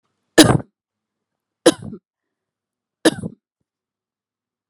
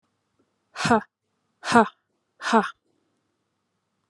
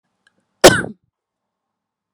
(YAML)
three_cough_length: 4.7 s
three_cough_amplitude: 32768
three_cough_signal_mean_std_ratio: 0.21
exhalation_length: 4.1 s
exhalation_amplitude: 27303
exhalation_signal_mean_std_ratio: 0.26
cough_length: 2.1 s
cough_amplitude: 32768
cough_signal_mean_std_ratio: 0.2
survey_phase: alpha (2021-03-01 to 2021-08-12)
age: 18-44
gender: Female
wearing_mask: 'No'
symptom_none: true
smoker_status: Never smoked
respiratory_condition_asthma: false
respiratory_condition_other: false
recruitment_source: REACT
submission_delay: 1 day
covid_test_result: Negative
covid_test_method: RT-qPCR